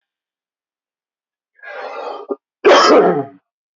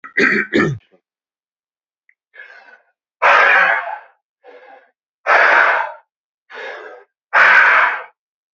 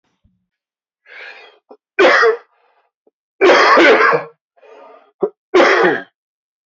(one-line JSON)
{"cough_length": "3.8 s", "cough_amplitude": 28832, "cough_signal_mean_std_ratio": 0.38, "exhalation_length": "8.5 s", "exhalation_amplitude": 32768, "exhalation_signal_mean_std_ratio": 0.47, "three_cough_length": "6.7 s", "three_cough_amplitude": 30606, "three_cough_signal_mean_std_ratio": 0.45, "survey_phase": "beta (2021-08-13 to 2022-03-07)", "age": "18-44", "gender": "Male", "wearing_mask": "No", "symptom_cough_any": true, "symptom_runny_or_blocked_nose": true, "symptom_headache": true, "smoker_status": "Ex-smoker", "respiratory_condition_asthma": false, "respiratory_condition_other": false, "recruitment_source": "Test and Trace", "submission_delay": "1 day", "covid_test_result": "Positive", "covid_test_method": "RT-qPCR", "covid_ct_value": 24.6, "covid_ct_gene": "ORF1ab gene"}